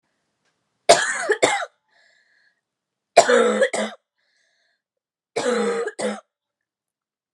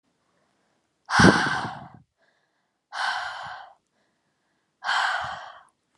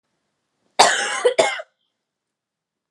{"three_cough_length": "7.3 s", "three_cough_amplitude": 32768, "three_cough_signal_mean_std_ratio": 0.37, "exhalation_length": "6.0 s", "exhalation_amplitude": 30644, "exhalation_signal_mean_std_ratio": 0.35, "cough_length": "2.9 s", "cough_amplitude": 32767, "cough_signal_mean_std_ratio": 0.35, "survey_phase": "alpha (2021-03-01 to 2021-08-12)", "age": "18-44", "gender": "Female", "wearing_mask": "No", "symptom_fatigue": true, "symptom_change_to_sense_of_smell_or_taste": true, "symptom_loss_of_taste": true, "smoker_status": "Ex-smoker", "respiratory_condition_asthma": false, "respiratory_condition_other": false, "recruitment_source": "REACT", "submission_delay": "2 days", "covid_test_result": "Negative", "covid_test_method": "RT-qPCR"}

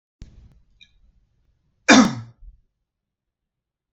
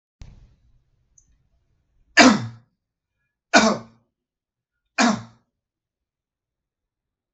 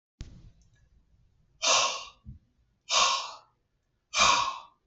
{"cough_length": "3.9 s", "cough_amplitude": 32768, "cough_signal_mean_std_ratio": 0.21, "three_cough_length": "7.3 s", "three_cough_amplitude": 32768, "three_cough_signal_mean_std_ratio": 0.23, "exhalation_length": "4.9 s", "exhalation_amplitude": 11589, "exhalation_signal_mean_std_ratio": 0.41, "survey_phase": "beta (2021-08-13 to 2022-03-07)", "age": "45-64", "gender": "Male", "wearing_mask": "No", "symptom_none": true, "smoker_status": "Never smoked", "respiratory_condition_asthma": false, "respiratory_condition_other": false, "recruitment_source": "REACT", "submission_delay": "2 days", "covid_test_result": "Negative", "covid_test_method": "RT-qPCR", "influenza_a_test_result": "Negative", "influenza_b_test_result": "Negative"}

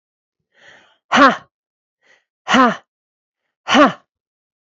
{"exhalation_length": "4.8 s", "exhalation_amplitude": 28413, "exhalation_signal_mean_std_ratio": 0.3, "survey_phase": "beta (2021-08-13 to 2022-03-07)", "age": "45-64", "gender": "Female", "wearing_mask": "No", "symptom_runny_or_blocked_nose": true, "symptom_shortness_of_breath": true, "symptom_abdominal_pain": true, "symptom_onset": "2 days", "smoker_status": "Never smoked", "respiratory_condition_asthma": false, "respiratory_condition_other": false, "recruitment_source": "Test and Trace", "submission_delay": "1 day", "covid_test_result": "Positive", "covid_test_method": "RT-qPCR", "covid_ct_value": 18.6, "covid_ct_gene": "ORF1ab gene", "covid_ct_mean": 18.8, "covid_viral_load": "670000 copies/ml", "covid_viral_load_category": "Low viral load (10K-1M copies/ml)"}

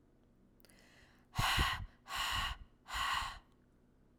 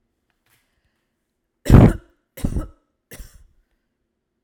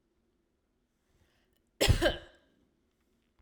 {"exhalation_length": "4.2 s", "exhalation_amplitude": 3163, "exhalation_signal_mean_std_ratio": 0.51, "three_cough_length": "4.4 s", "three_cough_amplitude": 32768, "three_cough_signal_mean_std_ratio": 0.22, "cough_length": "3.4 s", "cough_amplitude": 9436, "cough_signal_mean_std_ratio": 0.25, "survey_phase": "alpha (2021-03-01 to 2021-08-12)", "age": "18-44", "gender": "Female", "wearing_mask": "No", "symptom_none": true, "smoker_status": "Never smoked", "respiratory_condition_asthma": false, "respiratory_condition_other": false, "recruitment_source": "REACT", "submission_delay": "3 days", "covid_test_result": "Negative", "covid_test_method": "RT-qPCR"}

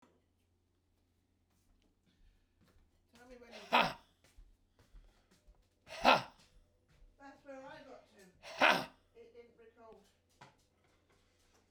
{"exhalation_length": "11.7 s", "exhalation_amplitude": 9852, "exhalation_signal_mean_std_ratio": 0.22, "survey_phase": "beta (2021-08-13 to 2022-03-07)", "age": "65+", "gender": "Male", "wearing_mask": "No", "symptom_none": true, "smoker_status": "Ex-smoker", "respiratory_condition_asthma": false, "respiratory_condition_other": false, "recruitment_source": "REACT", "submission_delay": "3 days", "covid_test_result": "Negative", "covid_test_method": "RT-qPCR", "influenza_a_test_result": "Negative", "influenza_b_test_result": "Negative"}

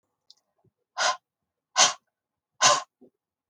{"exhalation_length": "3.5 s", "exhalation_amplitude": 21719, "exhalation_signal_mean_std_ratio": 0.29, "survey_phase": "beta (2021-08-13 to 2022-03-07)", "age": "45-64", "gender": "Female", "wearing_mask": "No", "symptom_none": true, "smoker_status": "Never smoked", "respiratory_condition_asthma": false, "respiratory_condition_other": false, "recruitment_source": "Test and Trace", "submission_delay": "2 days", "covid_test_result": "Negative", "covid_test_method": "RT-qPCR"}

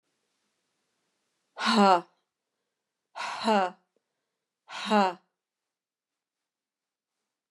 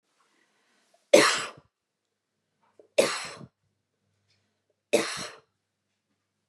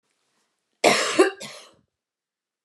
{"exhalation_length": "7.5 s", "exhalation_amplitude": 12764, "exhalation_signal_mean_std_ratio": 0.28, "three_cough_length": "6.5 s", "three_cough_amplitude": 25489, "three_cough_signal_mean_std_ratio": 0.24, "cough_length": "2.6 s", "cough_amplitude": 21235, "cough_signal_mean_std_ratio": 0.32, "survey_phase": "beta (2021-08-13 to 2022-03-07)", "age": "18-44", "gender": "Female", "wearing_mask": "No", "symptom_none": true, "symptom_onset": "13 days", "smoker_status": "Never smoked", "respiratory_condition_asthma": false, "respiratory_condition_other": false, "recruitment_source": "REACT", "submission_delay": "0 days", "covid_test_result": "Negative", "covid_test_method": "RT-qPCR", "influenza_a_test_result": "Negative", "influenza_b_test_result": "Negative"}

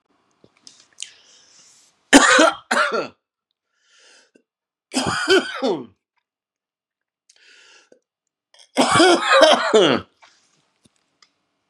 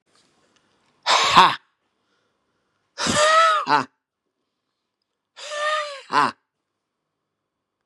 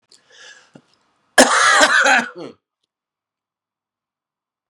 {"three_cough_length": "11.7 s", "three_cough_amplitude": 32767, "three_cough_signal_mean_std_ratio": 0.36, "exhalation_length": "7.9 s", "exhalation_amplitude": 32768, "exhalation_signal_mean_std_ratio": 0.37, "cough_length": "4.7 s", "cough_amplitude": 32768, "cough_signal_mean_std_ratio": 0.35, "survey_phase": "beta (2021-08-13 to 2022-03-07)", "age": "65+", "gender": "Male", "wearing_mask": "No", "symptom_cough_any": true, "symptom_runny_or_blocked_nose": true, "symptom_fatigue": true, "symptom_fever_high_temperature": true, "symptom_headache": true, "symptom_change_to_sense_of_smell_or_taste": true, "symptom_onset": "3 days", "smoker_status": "Ex-smoker", "respiratory_condition_asthma": false, "respiratory_condition_other": false, "recruitment_source": "Test and Trace", "submission_delay": "1 day", "covid_test_result": "Positive", "covid_test_method": "RT-qPCR", "covid_ct_value": 22.1, "covid_ct_gene": "ORF1ab gene", "covid_ct_mean": 22.5, "covid_viral_load": "40000 copies/ml", "covid_viral_load_category": "Low viral load (10K-1M copies/ml)"}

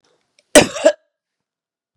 {"cough_length": "2.0 s", "cough_amplitude": 32768, "cough_signal_mean_std_ratio": 0.25, "survey_phase": "beta (2021-08-13 to 2022-03-07)", "age": "45-64", "gender": "Female", "wearing_mask": "No", "symptom_cough_any": true, "smoker_status": "Never smoked", "respiratory_condition_asthma": false, "respiratory_condition_other": false, "recruitment_source": "REACT", "submission_delay": "1 day", "covid_test_result": "Negative", "covid_test_method": "RT-qPCR", "influenza_a_test_result": "Negative", "influenza_b_test_result": "Negative"}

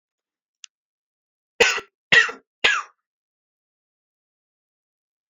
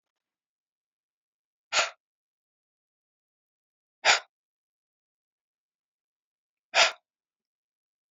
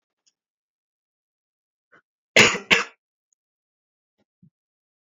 {"three_cough_length": "5.3 s", "three_cough_amplitude": 28173, "three_cough_signal_mean_std_ratio": 0.23, "exhalation_length": "8.1 s", "exhalation_amplitude": 18239, "exhalation_signal_mean_std_ratio": 0.17, "cough_length": "5.1 s", "cough_amplitude": 32767, "cough_signal_mean_std_ratio": 0.18, "survey_phase": "alpha (2021-03-01 to 2021-08-12)", "age": "18-44", "gender": "Male", "wearing_mask": "No", "symptom_new_continuous_cough": true, "symptom_fatigue": true, "symptom_fever_high_temperature": true, "smoker_status": "Never smoked", "respiratory_condition_asthma": false, "respiratory_condition_other": false, "recruitment_source": "Test and Trace", "submission_delay": "1 day", "covid_test_result": "Positive", "covid_test_method": "RT-qPCR"}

